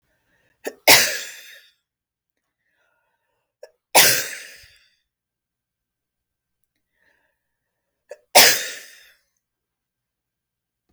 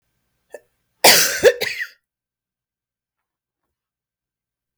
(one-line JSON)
{"three_cough_length": "10.9 s", "three_cough_amplitude": 32768, "three_cough_signal_mean_std_ratio": 0.22, "cough_length": "4.8 s", "cough_amplitude": 32768, "cough_signal_mean_std_ratio": 0.25, "survey_phase": "beta (2021-08-13 to 2022-03-07)", "age": "45-64", "gender": "Female", "wearing_mask": "No", "symptom_cough_any": true, "symptom_runny_or_blocked_nose": true, "symptom_headache": true, "symptom_onset": "8 days", "smoker_status": "Never smoked", "respiratory_condition_asthma": false, "respiratory_condition_other": true, "recruitment_source": "Test and Trace", "submission_delay": "2 days", "covid_test_result": "Negative", "covid_test_method": "RT-qPCR"}